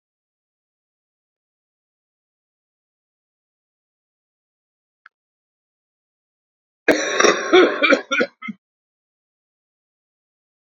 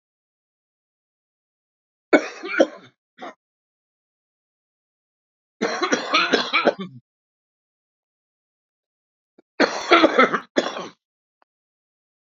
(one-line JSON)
{"cough_length": "10.8 s", "cough_amplitude": 32768, "cough_signal_mean_std_ratio": 0.24, "three_cough_length": "12.3 s", "three_cough_amplitude": 31337, "three_cough_signal_mean_std_ratio": 0.29, "survey_phase": "beta (2021-08-13 to 2022-03-07)", "age": "65+", "gender": "Male", "wearing_mask": "No", "symptom_cough_any": true, "smoker_status": "Current smoker (11 or more cigarettes per day)", "respiratory_condition_asthma": false, "respiratory_condition_other": true, "recruitment_source": "REACT", "submission_delay": "1 day", "covid_test_result": "Negative", "covid_test_method": "RT-qPCR", "influenza_a_test_result": "Negative", "influenza_b_test_result": "Negative"}